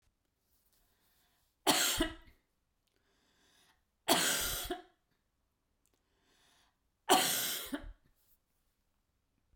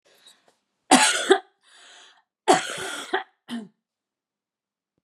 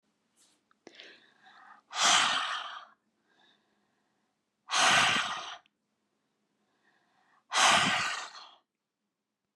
three_cough_length: 9.6 s
three_cough_amplitude: 7694
three_cough_signal_mean_std_ratio: 0.33
cough_length: 5.0 s
cough_amplitude: 27454
cough_signal_mean_std_ratio: 0.31
exhalation_length: 9.6 s
exhalation_amplitude: 11615
exhalation_signal_mean_std_ratio: 0.38
survey_phase: beta (2021-08-13 to 2022-03-07)
age: 65+
gender: Female
wearing_mask: 'No'
symptom_none: true
smoker_status: Ex-smoker
respiratory_condition_asthma: false
respiratory_condition_other: false
recruitment_source: REACT
submission_delay: 1 day
covid_test_result: Negative
covid_test_method: RT-qPCR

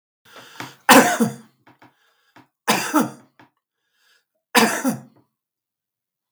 three_cough_length: 6.3 s
three_cough_amplitude: 32768
three_cough_signal_mean_std_ratio: 0.31
survey_phase: beta (2021-08-13 to 2022-03-07)
age: 65+
gender: Male
wearing_mask: 'No'
symptom_cough_any: true
symptom_runny_or_blocked_nose: true
smoker_status: Ex-smoker
respiratory_condition_asthma: false
respiratory_condition_other: false
recruitment_source: Test and Trace
submission_delay: 2 days
covid_test_result: Positive
covid_test_method: LFT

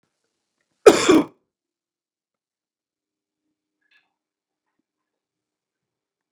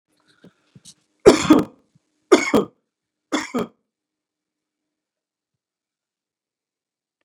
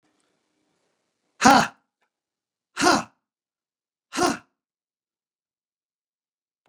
cough_length: 6.3 s
cough_amplitude: 32768
cough_signal_mean_std_ratio: 0.16
three_cough_length: 7.2 s
three_cough_amplitude: 32768
three_cough_signal_mean_std_ratio: 0.22
exhalation_length: 6.7 s
exhalation_amplitude: 32451
exhalation_signal_mean_std_ratio: 0.22
survey_phase: beta (2021-08-13 to 2022-03-07)
age: 45-64
gender: Male
wearing_mask: 'No'
symptom_cough_any: true
symptom_onset: 12 days
smoker_status: Ex-smoker
respiratory_condition_asthma: true
respiratory_condition_other: false
recruitment_source: REACT
submission_delay: 2 days
covid_test_result: Negative
covid_test_method: RT-qPCR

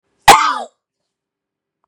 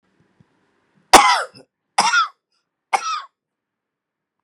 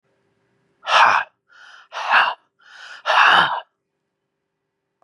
cough_length: 1.9 s
cough_amplitude: 32768
cough_signal_mean_std_ratio: 0.29
three_cough_length: 4.4 s
three_cough_amplitude: 32768
three_cough_signal_mean_std_ratio: 0.3
exhalation_length: 5.0 s
exhalation_amplitude: 31083
exhalation_signal_mean_std_ratio: 0.4
survey_phase: beta (2021-08-13 to 2022-03-07)
age: 45-64
gender: Male
wearing_mask: 'No'
symptom_runny_or_blocked_nose: true
smoker_status: Ex-smoker
respiratory_condition_asthma: false
respiratory_condition_other: false
recruitment_source: REACT
submission_delay: 1 day
covid_test_result: Negative
covid_test_method: RT-qPCR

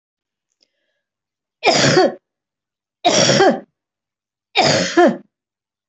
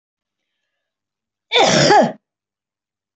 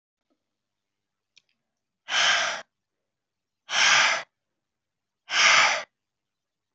three_cough_length: 5.9 s
three_cough_amplitude: 27721
three_cough_signal_mean_std_ratio: 0.43
cough_length: 3.2 s
cough_amplitude: 26025
cough_signal_mean_std_ratio: 0.36
exhalation_length: 6.7 s
exhalation_amplitude: 16627
exhalation_signal_mean_std_ratio: 0.37
survey_phase: beta (2021-08-13 to 2022-03-07)
age: 65+
gender: Female
wearing_mask: 'No'
symptom_none: true
smoker_status: Never smoked
respiratory_condition_asthma: false
respiratory_condition_other: false
recruitment_source: REACT
submission_delay: 2 days
covid_test_result: Negative
covid_test_method: RT-qPCR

